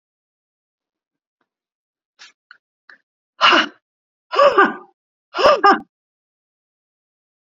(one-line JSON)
{"exhalation_length": "7.4 s", "exhalation_amplitude": 31644, "exhalation_signal_mean_std_ratio": 0.28, "survey_phase": "beta (2021-08-13 to 2022-03-07)", "age": "65+", "gender": "Female", "wearing_mask": "No", "symptom_none": true, "smoker_status": "Never smoked", "respiratory_condition_asthma": false, "respiratory_condition_other": false, "recruitment_source": "REACT", "submission_delay": "1 day", "covid_test_result": "Negative", "covid_test_method": "RT-qPCR", "influenza_a_test_result": "Negative", "influenza_b_test_result": "Negative"}